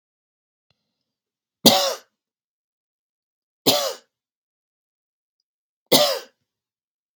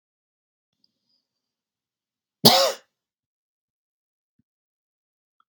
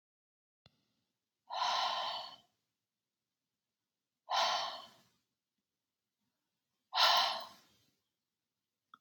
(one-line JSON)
{"three_cough_length": "7.2 s", "three_cough_amplitude": 32768, "three_cough_signal_mean_std_ratio": 0.24, "cough_length": "5.5 s", "cough_amplitude": 32767, "cough_signal_mean_std_ratio": 0.16, "exhalation_length": "9.0 s", "exhalation_amplitude": 5264, "exhalation_signal_mean_std_ratio": 0.33, "survey_phase": "beta (2021-08-13 to 2022-03-07)", "age": "45-64", "gender": "Female", "wearing_mask": "No", "symptom_none": true, "smoker_status": "Ex-smoker", "respiratory_condition_asthma": false, "respiratory_condition_other": false, "recruitment_source": "REACT", "submission_delay": "2 days", "covid_test_result": "Negative", "covid_test_method": "RT-qPCR"}